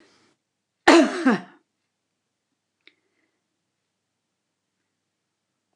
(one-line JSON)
{"cough_length": "5.8 s", "cough_amplitude": 29203, "cough_signal_mean_std_ratio": 0.2, "survey_phase": "beta (2021-08-13 to 2022-03-07)", "age": "65+", "gender": "Female", "wearing_mask": "No", "symptom_none": true, "smoker_status": "Ex-smoker", "respiratory_condition_asthma": false, "respiratory_condition_other": false, "recruitment_source": "REACT", "submission_delay": "1 day", "covid_test_result": "Negative", "covid_test_method": "RT-qPCR"}